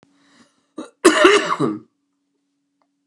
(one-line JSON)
{"cough_length": "3.1 s", "cough_amplitude": 29204, "cough_signal_mean_std_ratio": 0.35, "survey_phase": "beta (2021-08-13 to 2022-03-07)", "age": "65+", "gender": "Male", "wearing_mask": "No", "symptom_cough_any": true, "symptom_runny_or_blocked_nose": true, "symptom_change_to_sense_of_smell_or_taste": true, "symptom_onset": "3 days", "smoker_status": "Never smoked", "respiratory_condition_asthma": true, "respiratory_condition_other": false, "recruitment_source": "Test and Trace", "submission_delay": "1 day", "covid_test_result": "Positive", "covid_test_method": "RT-qPCR", "covid_ct_value": 16.1, "covid_ct_gene": "ORF1ab gene", "covid_ct_mean": 16.6, "covid_viral_load": "3600000 copies/ml", "covid_viral_load_category": "High viral load (>1M copies/ml)"}